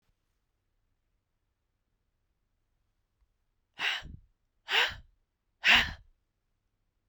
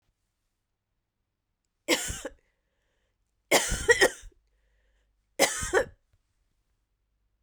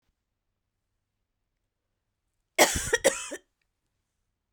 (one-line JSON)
{"exhalation_length": "7.1 s", "exhalation_amplitude": 10103, "exhalation_signal_mean_std_ratio": 0.23, "three_cough_length": "7.4 s", "three_cough_amplitude": 15749, "three_cough_signal_mean_std_ratio": 0.28, "cough_length": "4.5 s", "cough_amplitude": 19862, "cough_signal_mean_std_ratio": 0.23, "survey_phase": "beta (2021-08-13 to 2022-03-07)", "age": "18-44", "gender": "Female", "wearing_mask": "No", "symptom_cough_any": true, "symptom_runny_or_blocked_nose": true, "symptom_shortness_of_breath": true, "symptom_fatigue": true, "symptom_fever_high_temperature": true, "symptom_headache": true, "symptom_change_to_sense_of_smell_or_taste": true, "symptom_loss_of_taste": true, "symptom_onset": "3 days", "smoker_status": "Never smoked", "respiratory_condition_asthma": false, "respiratory_condition_other": false, "recruitment_source": "Test and Trace", "submission_delay": "2 days", "covid_test_result": "Positive", "covid_test_method": "RT-qPCR", "covid_ct_value": 26.7, "covid_ct_gene": "ORF1ab gene", "covid_ct_mean": 27.2, "covid_viral_load": "1200 copies/ml", "covid_viral_load_category": "Minimal viral load (< 10K copies/ml)"}